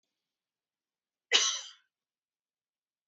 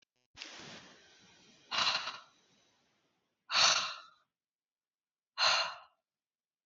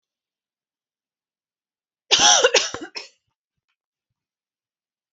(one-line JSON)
{"cough_length": "3.1 s", "cough_amplitude": 11167, "cough_signal_mean_std_ratio": 0.22, "exhalation_length": "6.7 s", "exhalation_amplitude": 7710, "exhalation_signal_mean_std_ratio": 0.34, "three_cough_length": "5.1 s", "three_cough_amplitude": 28261, "three_cough_signal_mean_std_ratio": 0.26, "survey_phase": "alpha (2021-03-01 to 2021-08-12)", "age": "18-44", "gender": "Female", "wearing_mask": "No", "symptom_none": true, "smoker_status": "Never smoked", "respiratory_condition_asthma": false, "respiratory_condition_other": false, "recruitment_source": "REACT", "submission_delay": "1 day", "covid_test_result": "Negative", "covid_test_method": "RT-qPCR"}